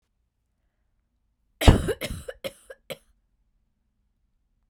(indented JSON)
{
  "cough_length": "4.7 s",
  "cough_amplitude": 32768,
  "cough_signal_mean_std_ratio": 0.19,
  "survey_phase": "beta (2021-08-13 to 2022-03-07)",
  "age": "18-44",
  "gender": "Female",
  "wearing_mask": "No",
  "symptom_cough_any": true,
  "symptom_runny_or_blocked_nose": true,
  "symptom_sore_throat": true,
  "symptom_fatigue": true,
  "symptom_fever_high_temperature": true,
  "symptom_headache": true,
  "symptom_change_to_sense_of_smell_or_taste": true,
  "symptom_other": true,
  "smoker_status": "Never smoked",
  "respiratory_condition_asthma": true,
  "respiratory_condition_other": false,
  "recruitment_source": "Test and Trace",
  "submission_delay": "1 day",
  "covid_test_result": "Positive",
  "covid_test_method": "ePCR"
}